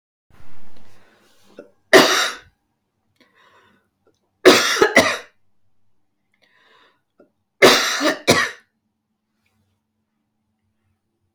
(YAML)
three_cough_length: 11.3 s
three_cough_amplitude: 32768
three_cough_signal_mean_std_ratio: 0.32
survey_phase: beta (2021-08-13 to 2022-03-07)
age: 45-64
gender: Female
wearing_mask: 'No'
symptom_cough_any: true
symptom_new_continuous_cough: true
symptom_runny_or_blocked_nose: true
symptom_shortness_of_breath: true
symptom_fatigue: true
symptom_onset: 3 days
smoker_status: Never smoked
respiratory_condition_asthma: false
respiratory_condition_other: true
recruitment_source: Test and Trace
submission_delay: 2 days
covid_test_result: Negative
covid_test_method: RT-qPCR